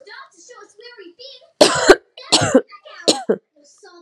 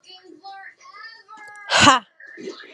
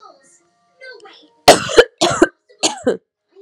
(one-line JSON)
{"three_cough_length": "4.0 s", "three_cough_amplitude": 32768, "three_cough_signal_mean_std_ratio": 0.34, "exhalation_length": "2.7 s", "exhalation_amplitude": 32750, "exhalation_signal_mean_std_ratio": 0.32, "cough_length": "3.4 s", "cough_amplitude": 32768, "cough_signal_mean_std_ratio": 0.32, "survey_phase": "alpha (2021-03-01 to 2021-08-12)", "age": "18-44", "gender": "Female", "wearing_mask": "No", "symptom_none": true, "symptom_onset": "3 days", "smoker_status": "Never smoked", "respiratory_condition_asthma": false, "respiratory_condition_other": false, "recruitment_source": "REACT", "submission_delay": "1 day", "covid_test_result": "Negative", "covid_test_method": "RT-qPCR"}